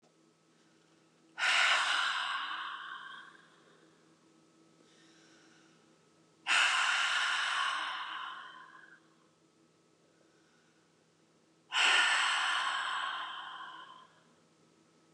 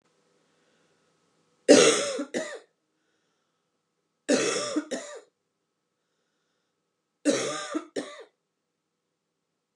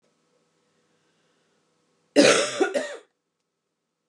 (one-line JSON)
{"exhalation_length": "15.1 s", "exhalation_amplitude": 6555, "exhalation_signal_mean_std_ratio": 0.5, "three_cough_length": "9.8 s", "three_cough_amplitude": 24540, "three_cough_signal_mean_std_ratio": 0.29, "cough_length": "4.1 s", "cough_amplitude": 22021, "cough_signal_mean_std_ratio": 0.29, "survey_phase": "beta (2021-08-13 to 2022-03-07)", "age": "18-44", "gender": "Female", "wearing_mask": "No", "symptom_cough_any": true, "symptom_runny_or_blocked_nose": true, "symptom_sore_throat": true, "symptom_headache": true, "smoker_status": "Never smoked", "respiratory_condition_asthma": false, "respiratory_condition_other": false, "recruitment_source": "Test and Trace", "submission_delay": "1 day", "covid_test_result": "Positive", "covid_test_method": "RT-qPCR", "covid_ct_value": 29.1, "covid_ct_gene": "N gene"}